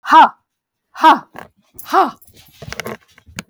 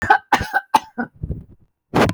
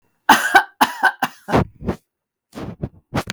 {"exhalation_length": "3.5 s", "exhalation_amplitude": 32766, "exhalation_signal_mean_std_ratio": 0.34, "cough_length": "2.1 s", "cough_amplitude": 31247, "cough_signal_mean_std_ratio": 0.45, "three_cough_length": "3.3 s", "three_cough_amplitude": 32768, "three_cough_signal_mean_std_ratio": 0.4, "survey_phase": "beta (2021-08-13 to 2022-03-07)", "age": "65+", "gender": "Female", "wearing_mask": "No", "symptom_none": true, "smoker_status": "Never smoked", "respiratory_condition_asthma": false, "respiratory_condition_other": false, "recruitment_source": "Test and Trace", "submission_delay": "2 days", "covid_test_result": "Negative", "covid_test_method": "RT-qPCR"}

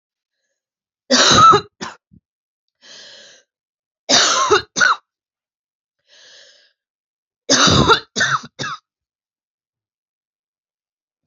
{"three_cough_length": "11.3 s", "three_cough_amplitude": 32768, "three_cough_signal_mean_std_ratio": 0.34, "survey_phase": "beta (2021-08-13 to 2022-03-07)", "age": "45-64", "gender": "Female", "wearing_mask": "No", "symptom_cough_any": true, "symptom_runny_or_blocked_nose": true, "symptom_shortness_of_breath": true, "symptom_sore_throat": true, "symptom_fatigue": true, "symptom_headache": true, "symptom_change_to_sense_of_smell_or_taste": true, "smoker_status": "Never smoked", "respiratory_condition_asthma": false, "respiratory_condition_other": false, "recruitment_source": "Test and Trace", "submission_delay": "0 days", "covid_test_result": "Negative", "covid_test_method": "LFT"}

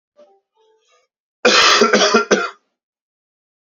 {"cough_length": "3.7 s", "cough_amplitude": 32767, "cough_signal_mean_std_ratio": 0.42, "survey_phase": "alpha (2021-03-01 to 2021-08-12)", "age": "18-44", "gender": "Male", "wearing_mask": "No", "symptom_fever_high_temperature": true, "smoker_status": "Current smoker (e-cigarettes or vapes only)", "respiratory_condition_asthma": false, "respiratory_condition_other": false, "recruitment_source": "Test and Trace", "submission_delay": "1 day", "covid_test_result": "Positive", "covid_test_method": "RT-qPCR", "covid_ct_value": 14.8, "covid_ct_gene": "ORF1ab gene", "covid_ct_mean": 15.4, "covid_viral_load": "8700000 copies/ml", "covid_viral_load_category": "High viral load (>1M copies/ml)"}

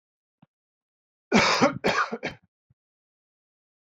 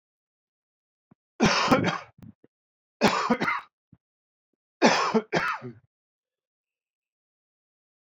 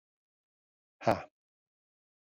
{"cough_length": "3.8 s", "cough_amplitude": 19547, "cough_signal_mean_std_ratio": 0.34, "three_cough_length": "8.1 s", "three_cough_amplitude": 18999, "three_cough_signal_mean_std_ratio": 0.36, "exhalation_length": "2.2 s", "exhalation_amplitude": 7267, "exhalation_signal_mean_std_ratio": 0.17, "survey_phase": "beta (2021-08-13 to 2022-03-07)", "age": "45-64", "gender": "Male", "wearing_mask": "No", "symptom_cough_any": true, "symptom_runny_or_blocked_nose": true, "symptom_headache": true, "smoker_status": "Never smoked", "respiratory_condition_asthma": false, "respiratory_condition_other": false, "recruitment_source": "Test and Trace", "submission_delay": "2 days", "covid_test_result": "Positive", "covid_test_method": "LFT"}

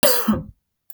{"cough_length": "0.9 s", "cough_amplitude": 28592, "cough_signal_mean_std_ratio": 0.53, "survey_phase": "beta (2021-08-13 to 2022-03-07)", "age": "18-44", "gender": "Female", "wearing_mask": "No", "symptom_none": true, "smoker_status": "Never smoked", "respiratory_condition_asthma": false, "respiratory_condition_other": false, "recruitment_source": "REACT", "submission_delay": "3 days", "covid_test_result": "Negative", "covid_test_method": "RT-qPCR", "influenza_a_test_result": "Negative", "influenza_b_test_result": "Negative"}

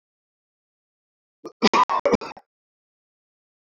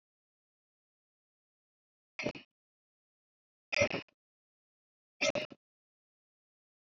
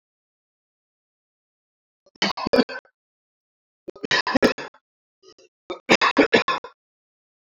{"cough_length": "3.8 s", "cough_amplitude": 25763, "cough_signal_mean_std_ratio": 0.26, "exhalation_length": "6.9 s", "exhalation_amplitude": 5800, "exhalation_signal_mean_std_ratio": 0.2, "three_cough_length": "7.4 s", "three_cough_amplitude": 25764, "three_cough_signal_mean_std_ratio": 0.29, "survey_phase": "beta (2021-08-13 to 2022-03-07)", "age": "18-44", "gender": "Male", "wearing_mask": "No", "symptom_none": true, "smoker_status": "Never smoked", "respiratory_condition_asthma": false, "respiratory_condition_other": false, "recruitment_source": "REACT", "submission_delay": "3 days", "covid_test_result": "Negative", "covid_test_method": "RT-qPCR"}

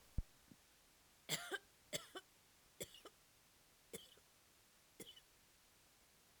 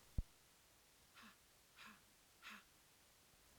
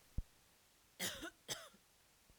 {"three_cough_length": "6.4 s", "three_cough_amplitude": 1412, "three_cough_signal_mean_std_ratio": 0.33, "exhalation_length": "3.6 s", "exhalation_amplitude": 1415, "exhalation_signal_mean_std_ratio": 0.3, "cough_length": "2.4 s", "cough_amplitude": 1475, "cough_signal_mean_std_ratio": 0.39, "survey_phase": "alpha (2021-03-01 to 2021-08-12)", "age": "45-64", "gender": "Female", "wearing_mask": "No", "symptom_none": true, "smoker_status": "Ex-smoker", "respiratory_condition_asthma": false, "respiratory_condition_other": false, "recruitment_source": "REACT", "submission_delay": "2 days", "covid_test_result": "Negative", "covid_test_method": "RT-qPCR"}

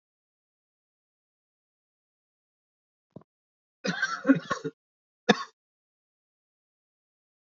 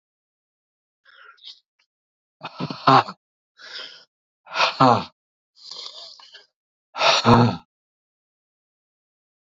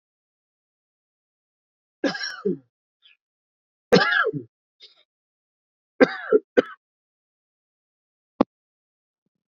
{"cough_length": "7.6 s", "cough_amplitude": 19686, "cough_signal_mean_std_ratio": 0.19, "exhalation_length": "9.6 s", "exhalation_amplitude": 27441, "exhalation_signal_mean_std_ratio": 0.29, "three_cough_length": "9.5 s", "three_cough_amplitude": 27280, "three_cough_signal_mean_std_ratio": 0.23, "survey_phase": "beta (2021-08-13 to 2022-03-07)", "age": "45-64", "gender": "Male", "wearing_mask": "No", "symptom_cough_any": true, "symptom_new_continuous_cough": true, "symptom_runny_or_blocked_nose": true, "symptom_sore_throat": true, "symptom_fever_high_temperature": true, "symptom_headache": true, "symptom_change_to_sense_of_smell_or_taste": true, "smoker_status": "Never smoked", "respiratory_condition_asthma": false, "respiratory_condition_other": false, "recruitment_source": "Test and Trace", "submission_delay": "2 days", "covid_test_result": "Positive", "covid_test_method": "LFT"}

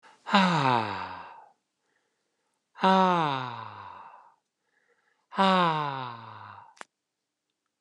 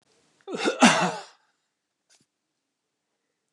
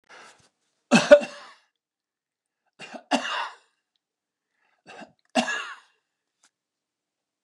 {"exhalation_length": "7.8 s", "exhalation_amplitude": 19276, "exhalation_signal_mean_std_ratio": 0.4, "cough_length": "3.5 s", "cough_amplitude": 28476, "cough_signal_mean_std_ratio": 0.28, "three_cough_length": "7.4 s", "three_cough_amplitude": 29204, "three_cough_signal_mean_std_ratio": 0.21, "survey_phase": "beta (2021-08-13 to 2022-03-07)", "age": "65+", "gender": "Male", "wearing_mask": "No", "symptom_none": true, "smoker_status": "Never smoked", "respiratory_condition_asthma": false, "respiratory_condition_other": false, "recruitment_source": "REACT", "submission_delay": "2 days", "covid_test_result": "Negative", "covid_test_method": "RT-qPCR", "influenza_a_test_result": "Negative", "influenza_b_test_result": "Negative"}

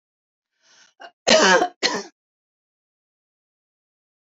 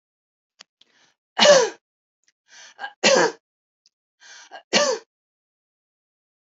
{"cough_length": "4.3 s", "cough_amplitude": 27437, "cough_signal_mean_std_ratio": 0.28, "three_cough_length": "6.5 s", "three_cough_amplitude": 26580, "three_cough_signal_mean_std_ratio": 0.29, "survey_phase": "beta (2021-08-13 to 2022-03-07)", "age": "45-64", "gender": "Female", "wearing_mask": "No", "symptom_none": true, "smoker_status": "Never smoked", "respiratory_condition_asthma": false, "respiratory_condition_other": false, "recruitment_source": "REACT", "submission_delay": "2 days", "covid_test_result": "Negative", "covid_test_method": "RT-qPCR", "influenza_a_test_result": "Negative", "influenza_b_test_result": "Negative"}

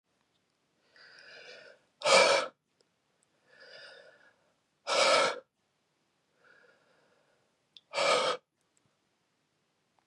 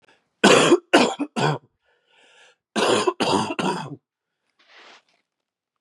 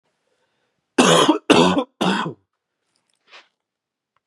{"exhalation_length": "10.1 s", "exhalation_amplitude": 9871, "exhalation_signal_mean_std_ratio": 0.3, "cough_length": "5.8 s", "cough_amplitude": 31010, "cough_signal_mean_std_ratio": 0.41, "three_cough_length": "4.3 s", "three_cough_amplitude": 32768, "three_cough_signal_mean_std_ratio": 0.38, "survey_phase": "beta (2021-08-13 to 2022-03-07)", "age": "18-44", "gender": "Male", "wearing_mask": "No", "symptom_cough_any": true, "symptom_runny_or_blocked_nose": true, "symptom_fatigue": true, "symptom_headache": true, "symptom_onset": "4 days", "smoker_status": "Never smoked", "respiratory_condition_asthma": false, "respiratory_condition_other": false, "recruitment_source": "Test and Trace", "submission_delay": "2 days", "covid_test_result": "Positive", "covid_test_method": "ePCR"}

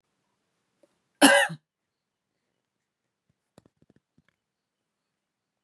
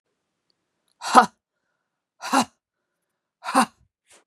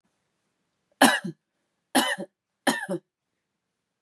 {"cough_length": "5.6 s", "cough_amplitude": 26002, "cough_signal_mean_std_ratio": 0.17, "exhalation_length": "4.3 s", "exhalation_amplitude": 32768, "exhalation_signal_mean_std_ratio": 0.23, "three_cough_length": "4.0 s", "three_cough_amplitude": 24493, "three_cough_signal_mean_std_ratio": 0.29, "survey_phase": "beta (2021-08-13 to 2022-03-07)", "age": "18-44", "gender": "Female", "wearing_mask": "No", "symptom_cough_any": true, "smoker_status": "Never smoked", "respiratory_condition_asthma": false, "respiratory_condition_other": false, "recruitment_source": "Test and Trace", "submission_delay": "-1 day", "covid_test_result": "Positive", "covid_test_method": "LFT"}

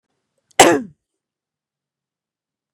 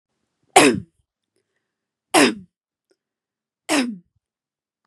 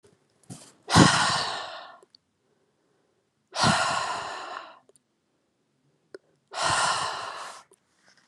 {"cough_length": "2.7 s", "cough_amplitude": 32768, "cough_signal_mean_std_ratio": 0.21, "three_cough_length": "4.9 s", "three_cough_amplitude": 32768, "three_cough_signal_mean_std_ratio": 0.27, "exhalation_length": "8.3 s", "exhalation_amplitude": 25720, "exhalation_signal_mean_std_ratio": 0.4, "survey_phase": "beta (2021-08-13 to 2022-03-07)", "age": "18-44", "gender": "Female", "wearing_mask": "No", "symptom_none": true, "smoker_status": "Ex-smoker", "respiratory_condition_asthma": false, "respiratory_condition_other": false, "recruitment_source": "REACT", "submission_delay": "2 days", "covid_test_result": "Negative", "covid_test_method": "RT-qPCR", "influenza_a_test_result": "Negative", "influenza_b_test_result": "Negative"}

